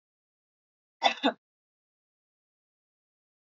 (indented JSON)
{
  "cough_length": "3.4 s",
  "cough_amplitude": 13443,
  "cough_signal_mean_std_ratio": 0.17,
  "survey_phase": "alpha (2021-03-01 to 2021-08-12)",
  "age": "45-64",
  "gender": "Female",
  "wearing_mask": "No",
  "symptom_none": true,
  "smoker_status": "Ex-smoker",
  "respiratory_condition_asthma": false,
  "respiratory_condition_other": false,
  "recruitment_source": "REACT",
  "submission_delay": "3 days",
  "covid_test_result": "Negative",
  "covid_test_method": "RT-qPCR"
}